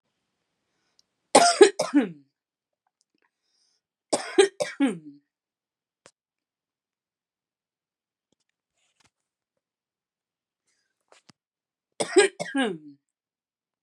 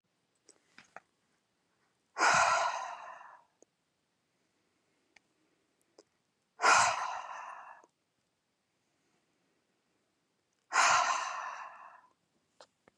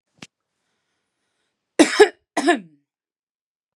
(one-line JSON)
{"three_cough_length": "13.8 s", "three_cough_amplitude": 29059, "three_cough_signal_mean_std_ratio": 0.22, "exhalation_length": "13.0 s", "exhalation_amplitude": 8008, "exhalation_signal_mean_std_ratio": 0.32, "cough_length": "3.8 s", "cough_amplitude": 32767, "cough_signal_mean_std_ratio": 0.24, "survey_phase": "beta (2021-08-13 to 2022-03-07)", "age": "18-44", "gender": "Female", "wearing_mask": "No", "symptom_none": true, "smoker_status": "Ex-smoker", "respiratory_condition_asthma": false, "respiratory_condition_other": false, "recruitment_source": "REACT", "submission_delay": "0 days", "covid_test_result": "Negative", "covid_test_method": "RT-qPCR", "influenza_a_test_result": "Negative", "influenza_b_test_result": "Negative"}